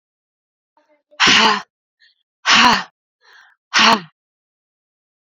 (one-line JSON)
{"exhalation_length": "5.3 s", "exhalation_amplitude": 32767, "exhalation_signal_mean_std_ratio": 0.36, "survey_phase": "beta (2021-08-13 to 2022-03-07)", "age": "18-44", "gender": "Female", "wearing_mask": "No", "symptom_cough_any": true, "symptom_runny_or_blocked_nose": true, "symptom_shortness_of_breath": true, "symptom_abdominal_pain": true, "symptom_diarrhoea": true, "symptom_fatigue": true, "symptom_fever_high_temperature": true, "symptom_other": true, "smoker_status": "Current smoker (1 to 10 cigarettes per day)", "respiratory_condition_asthma": true, "respiratory_condition_other": false, "recruitment_source": "Test and Trace", "submission_delay": "2 days", "covid_test_result": "Positive", "covid_test_method": "RT-qPCR", "covid_ct_value": 25.0, "covid_ct_gene": "N gene"}